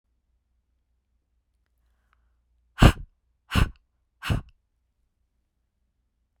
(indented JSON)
{
  "exhalation_length": "6.4 s",
  "exhalation_amplitude": 27790,
  "exhalation_signal_mean_std_ratio": 0.18,
  "survey_phase": "beta (2021-08-13 to 2022-03-07)",
  "age": "18-44",
  "gender": "Female",
  "wearing_mask": "No",
  "symptom_cough_any": true,
  "symptom_runny_or_blocked_nose": true,
  "symptom_sore_throat": true,
  "symptom_fatigue": true,
  "symptom_fever_high_temperature": true,
  "symptom_headache": true,
  "symptom_change_to_sense_of_smell_or_taste": true,
  "symptom_other": true,
  "smoker_status": "Never smoked",
  "respiratory_condition_asthma": true,
  "respiratory_condition_other": false,
  "recruitment_source": "Test and Trace",
  "submission_delay": "1 day",
  "covid_test_result": "Positive",
  "covid_test_method": "ePCR"
}